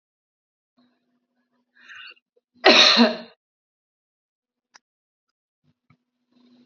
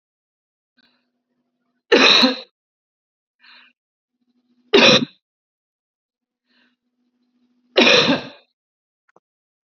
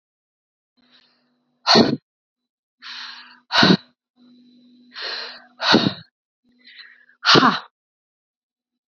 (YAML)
cough_length: 6.7 s
cough_amplitude: 30810
cough_signal_mean_std_ratio: 0.22
three_cough_length: 9.6 s
three_cough_amplitude: 31586
three_cough_signal_mean_std_ratio: 0.28
exhalation_length: 8.9 s
exhalation_amplitude: 29259
exhalation_signal_mean_std_ratio: 0.3
survey_phase: beta (2021-08-13 to 2022-03-07)
age: 45-64
gender: Female
wearing_mask: 'No'
symptom_cough_any: true
symptom_runny_or_blocked_nose: true
symptom_shortness_of_breath: true
symptom_fever_high_temperature: true
symptom_headache: true
smoker_status: Never smoked
respiratory_condition_asthma: false
respiratory_condition_other: false
recruitment_source: Test and Trace
submission_delay: 2 days
covid_test_result: Positive
covid_test_method: RT-qPCR